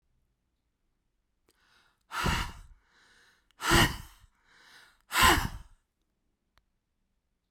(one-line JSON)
{"exhalation_length": "7.5 s", "exhalation_amplitude": 12059, "exhalation_signal_mean_std_ratio": 0.28, "survey_phase": "beta (2021-08-13 to 2022-03-07)", "age": "65+", "gender": "Male", "wearing_mask": "No", "symptom_none": true, "smoker_status": "Ex-smoker", "respiratory_condition_asthma": false, "respiratory_condition_other": false, "recruitment_source": "REACT", "submission_delay": "1 day", "covid_test_result": "Negative", "covid_test_method": "RT-qPCR"}